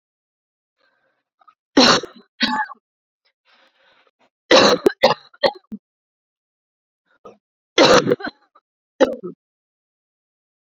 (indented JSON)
{
  "three_cough_length": "10.8 s",
  "three_cough_amplitude": 31118,
  "three_cough_signal_mean_std_ratio": 0.29,
  "survey_phase": "beta (2021-08-13 to 2022-03-07)",
  "age": "18-44",
  "gender": "Female",
  "wearing_mask": "No",
  "symptom_cough_any": true,
  "symptom_runny_or_blocked_nose": true,
  "symptom_fatigue": true,
  "symptom_headache": true,
  "symptom_change_to_sense_of_smell_or_taste": true,
  "symptom_loss_of_taste": true,
  "symptom_onset": "4 days",
  "smoker_status": "Never smoked",
  "respiratory_condition_asthma": true,
  "respiratory_condition_other": false,
  "recruitment_source": "Test and Trace",
  "submission_delay": "2 days",
  "covid_test_result": "Positive",
  "covid_test_method": "LAMP"
}